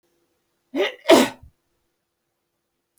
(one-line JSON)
{"cough_length": "3.0 s", "cough_amplitude": 29565, "cough_signal_mean_std_ratio": 0.25, "survey_phase": "beta (2021-08-13 to 2022-03-07)", "age": "65+", "gender": "Female", "wearing_mask": "No", "symptom_cough_any": true, "symptom_sore_throat": true, "smoker_status": "Never smoked", "respiratory_condition_asthma": false, "respiratory_condition_other": false, "recruitment_source": "REACT", "submission_delay": "1 day", "covid_test_result": "Negative", "covid_test_method": "RT-qPCR"}